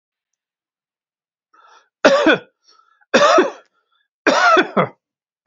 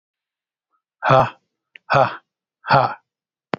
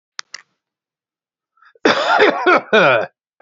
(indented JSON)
{
  "three_cough_length": "5.5 s",
  "three_cough_amplitude": 32767,
  "three_cough_signal_mean_std_ratio": 0.38,
  "exhalation_length": "3.6 s",
  "exhalation_amplitude": 32767,
  "exhalation_signal_mean_std_ratio": 0.33,
  "cough_length": "3.4 s",
  "cough_amplitude": 28051,
  "cough_signal_mean_std_ratio": 0.45,
  "survey_phase": "beta (2021-08-13 to 2022-03-07)",
  "age": "45-64",
  "gender": "Male",
  "wearing_mask": "No",
  "symptom_diarrhoea": true,
  "symptom_fatigue": true,
  "smoker_status": "Ex-smoker",
  "respiratory_condition_asthma": false,
  "respiratory_condition_other": false,
  "recruitment_source": "REACT",
  "submission_delay": "3 days",
  "covid_test_result": "Negative",
  "covid_test_method": "RT-qPCR",
  "influenza_a_test_result": "Negative",
  "influenza_b_test_result": "Negative"
}